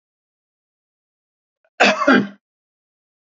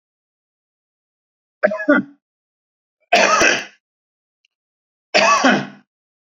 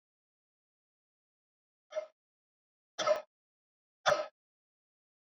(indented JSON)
{
  "cough_length": "3.2 s",
  "cough_amplitude": 32755,
  "cough_signal_mean_std_ratio": 0.28,
  "three_cough_length": "6.4 s",
  "three_cough_amplitude": 30171,
  "three_cough_signal_mean_std_ratio": 0.36,
  "exhalation_length": "5.3 s",
  "exhalation_amplitude": 6123,
  "exhalation_signal_mean_std_ratio": 0.22,
  "survey_phase": "beta (2021-08-13 to 2022-03-07)",
  "age": "65+",
  "gender": "Male",
  "wearing_mask": "No",
  "symptom_none": true,
  "smoker_status": "Ex-smoker",
  "respiratory_condition_asthma": false,
  "respiratory_condition_other": false,
  "recruitment_source": "REACT",
  "submission_delay": "1 day",
  "covid_test_result": "Negative",
  "covid_test_method": "RT-qPCR"
}